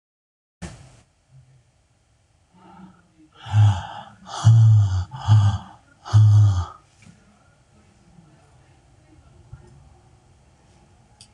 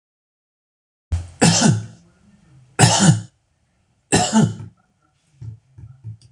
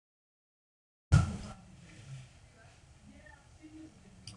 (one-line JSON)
{"exhalation_length": "11.3 s", "exhalation_amplitude": 20319, "exhalation_signal_mean_std_ratio": 0.37, "three_cough_length": "6.3 s", "three_cough_amplitude": 26028, "three_cough_signal_mean_std_ratio": 0.39, "cough_length": "4.4 s", "cough_amplitude": 8462, "cough_signal_mean_std_ratio": 0.25, "survey_phase": "beta (2021-08-13 to 2022-03-07)", "age": "45-64", "gender": "Male", "wearing_mask": "No", "symptom_none": true, "smoker_status": "Never smoked", "respiratory_condition_asthma": false, "respiratory_condition_other": false, "recruitment_source": "REACT", "submission_delay": "3 days", "covid_test_result": "Negative", "covid_test_method": "RT-qPCR"}